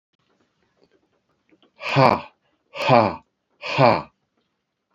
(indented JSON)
{
  "exhalation_length": "4.9 s",
  "exhalation_amplitude": 28318,
  "exhalation_signal_mean_std_ratio": 0.32,
  "survey_phase": "beta (2021-08-13 to 2022-03-07)",
  "age": "45-64",
  "gender": "Male",
  "wearing_mask": "No",
  "symptom_fatigue": true,
  "smoker_status": "Never smoked",
  "respiratory_condition_asthma": false,
  "respiratory_condition_other": false,
  "recruitment_source": "REACT",
  "submission_delay": "1 day",
  "covid_test_result": "Negative",
  "covid_test_method": "RT-qPCR"
}